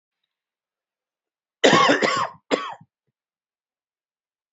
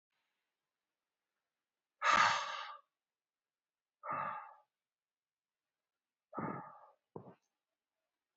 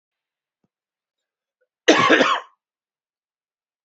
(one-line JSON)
{"three_cough_length": "4.5 s", "three_cough_amplitude": 27386, "three_cough_signal_mean_std_ratio": 0.31, "exhalation_length": "8.4 s", "exhalation_amplitude": 5142, "exhalation_signal_mean_std_ratio": 0.27, "cough_length": "3.8 s", "cough_amplitude": 27489, "cough_signal_mean_std_ratio": 0.28, "survey_phase": "beta (2021-08-13 to 2022-03-07)", "age": "45-64", "gender": "Male", "wearing_mask": "No", "symptom_cough_any": true, "symptom_fatigue": true, "symptom_headache": true, "symptom_onset": "4 days", "smoker_status": "Never smoked", "respiratory_condition_asthma": false, "respiratory_condition_other": false, "recruitment_source": "Test and Trace", "submission_delay": "1 day", "covid_test_result": "Positive", "covid_test_method": "RT-qPCR", "covid_ct_value": 25.6, "covid_ct_gene": "ORF1ab gene"}